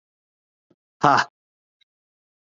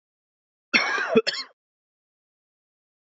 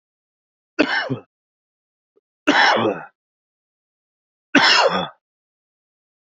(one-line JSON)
{"exhalation_length": "2.5 s", "exhalation_amplitude": 26806, "exhalation_signal_mean_std_ratio": 0.2, "cough_length": "3.1 s", "cough_amplitude": 19172, "cough_signal_mean_std_ratio": 0.31, "three_cough_length": "6.4 s", "three_cough_amplitude": 27206, "three_cough_signal_mean_std_ratio": 0.35, "survey_phase": "alpha (2021-03-01 to 2021-08-12)", "age": "18-44", "gender": "Male", "wearing_mask": "Yes", "symptom_cough_any": true, "symptom_new_continuous_cough": true, "symptom_diarrhoea": true, "symptom_onset": "3 days", "smoker_status": "Current smoker (1 to 10 cigarettes per day)", "recruitment_source": "Test and Trace", "submission_delay": "1 day", "covid_test_result": "Positive", "covid_test_method": "RT-qPCR", "covid_ct_value": 33.8, "covid_ct_gene": "N gene"}